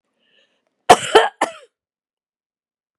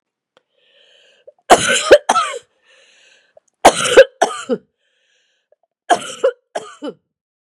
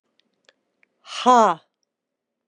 {"cough_length": "3.0 s", "cough_amplitude": 32768, "cough_signal_mean_std_ratio": 0.22, "three_cough_length": "7.5 s", "three_cough_amplitude": 32768, "three_cough_signal_mean_std_ratio": 0.31, "exhalation_length": "2.5 s", "exhalation_amplitude": 26978, "exhalation_signal_mean_std_ratio": 0.26, "survey_phase": "beta (2021-08-13 to 2022-03-07)", "age": "65+", "gender": "Female", "wearing_mask": "No", "symptom_runny_or_blocked_nose": true, "smoker_status": "Never smoked", "respiratory_condition_asthma": false, "respiratory_condition_other": false, "recruitment_source": "REACT", "submission_delay": "2 days", "covid_test_result": "Negative", "covid_test_method": "RT-qPCR"}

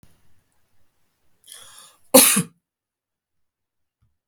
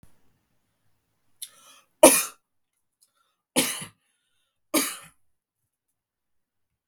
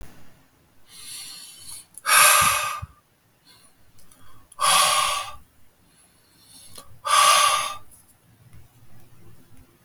{"cough_length": "4.3 s", "cough_amplitude": 32768, "cough_signal_mean_std_ratio": 0.2, "three_cough_length": "6.9 s", "three_cough_amplitude": 32768, "three_cough_signal_mean_std_ratio": 0.19, "exhalation_length": "9.8 s", "exhalation_amplitude": 25415, "exhalation_signal_mean_std_ratio": 0.42, "survey_phase": "beta (2021-08-13 to 2022-03-07)", "age": "18-44", "gender": "Male", "wearing_mask": "No", "symptom_none": true, "smoker_status": "Never smoked", "respiratory_condition_asthma": false, "respiratory_condition_other": false, "recruitment_source": "REACT", "submission_delay": "1 day", "covid_test_result": "Negative", "covid_test_method": "RT-qPCR", "influenza_a_test_result": "Negative", "influenza_b_test_result": "Negative"}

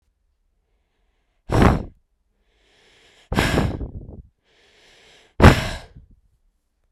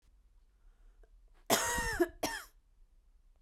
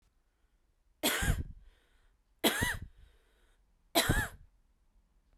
{"exhalation_length": "6.9 s", "exhalation_amplitude": 32768, "exhalation_signal_mean_std_ratio": 0.28, "cough_length": "3.4 s", "cough_amplitude": 6386, "cough_signal_mean_std_ratio": 0.39, "three_cough_length": "5.4 s", "three_cough_amplitude": 7522, "three_cough_signal_mean_std_ratio": 0.37, "survey_phase": "beta (2021-08-13 to 2022-03-07)", "age": "18-44", "gender": "Female", "wearing_mask": "No", "symptom_runny_or_blocked_nose": true, "symptom_sore_throat": true, "symptom_fatigue": true, "symptom_change_to_sense_of_smell_or_taste": true, "symptom_loss_of_taste": true, "smoker_status": "Ex-smoker", "respiratory_condition_asthma": false, "respiratory_condition_other": false, "recruitment_source": "Test and Trace", "submission_delay": "2 days", "covid_test_result": "Positive", "covid_test_method": "RT-qPCR", "covid_ct_value": 16.9, "covid_ct_gene": "ORF1ab gene", "covid_ct_mean": 17.3, "covid_viral_load": "2100000 copies/ml", "covid_viral_load_category": "High viral load (>1M copies/ml)"}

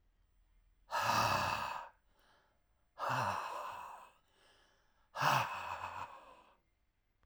{"exhalation_length": "7.3 s", "exhalation_amplitude": 5670, "exhalation_signal_mean_std_ratio": 0.49, "survey_phase": "alpha (2021-03-01 to 2021-08-12)", "age": "45-64", "gender": "Male", "wearing_mask": "No", "symptom_cough_any": true, "symptom_onset": "2 days", "smoker_status": "Never smoked", "respiratory_condition_asthma": false, "respiratory_condition_other": false, "recruitment_source": "Test and Trace", "submission_delay": "1 day", "covid_test_result": "Positive", "covid_test_method": "RT-qPCR", "covid_ct_value": 16.5, "covid_ct_gene": "ORF1ab gene", "covid_ct_mean": 16.9, "covid_viral_load": "2800000 copies/ml", "covid_viral_load_category": "High viral load (>1M copies/ml)"}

